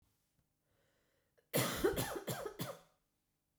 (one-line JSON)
{"cough_length": "3.6 s", "cough_amplitude": 2784, "cough_signal_mean_std_ratio": 0.41, "survey_phase": "beta (2021-08-13 to 2022-03-07)", "age": "45-64", "gender": "Female", "wearing_mask": "No", "symptom_cough_any": true, "symptom_runny_or_blocked_nose": true, "symptom_fatigue": true, "symptom_change_to_sense_of_smell_or_taste": true, "symptom_onset": "8 days", "smoker_status": "Never smoked", "respiratory_condition_asthma": true, "respiratory_condition_other": false, "recruitment_source": "Test and Trace", "submission_delay": "1 day", "covid_test_result": "Positive", "covid_test_method": "RT-qPCR", "covid_ct_value": 25.3, "covid_ct_gene": "N gene"}